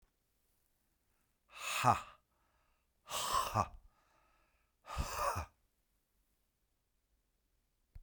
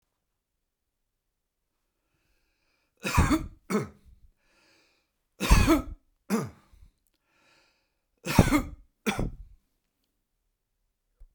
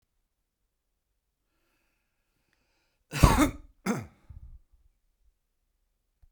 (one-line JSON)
{"exhalation_length": "8.0 s", "exhalation_amplitude": 5329, "exhalation_signal_mean_std_ratio": 0.32, "three_cough_length": "11.3 s", "three_cough_amplitude": 25111, "three_cough_signal_mean_std_ratio": 0.28, "cough_length": "6.3 s", "cough_amplitude": 27291, "cough_signal_mean_std_ratio": 0.2, "survey_phase": "beta (2021-08-13 to 2022-03-07)", "age": "65+", "gender": "Male", "wearing_mask": "No", "symptom_none": true, "smoker_status": "Current smoker (11 or more cigarettes per day)", "respiratory_condition_asthma": false, "respiratory_condition_other": false, "recruitment_source": "REACT", "submission_delay": "11 days", "covid_test_result": "Negative", "covid_test_method": "RT-qPCR"}